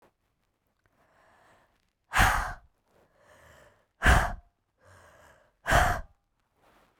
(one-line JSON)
{"exhalation_length": "7.0 s", "exhalation_amplitude": 15493, "exhalation_signal_mean_std_ratio": 0.3, "survey_phase": "beta (2021-08-13 to 2022-03-07)", "age": "18-44", "gender": "Female", "wearing_mask": "No", "symptom_cough_any": true, "symptom_new_continuous_cough": true, "symptom_runny_or_blocked_nose": true, "symptom_sore_throat": true, "symptom_fatigue": true, "symptom_fever_high_temperature": true, "symptom_onset": "7 days", "smoker_status": "Ex-smoker", "respiratory_condition_asthma": false, "respiratory_condition_other": false, "recruitment_source": "Test and Trace", "submission_delay": "1 day", "covid_test_result": "Positive", "covid_test_method": "RT-qPCR", "covid_ct_value": 18.2, "covid_ct_gene": "ORF1ab gene", "covid_ct_mean": 18.6, "covid_viral_load": "810000 copies/ml", "covid_viral_load_category": "Low viral load (10K-1M copies/ml)"}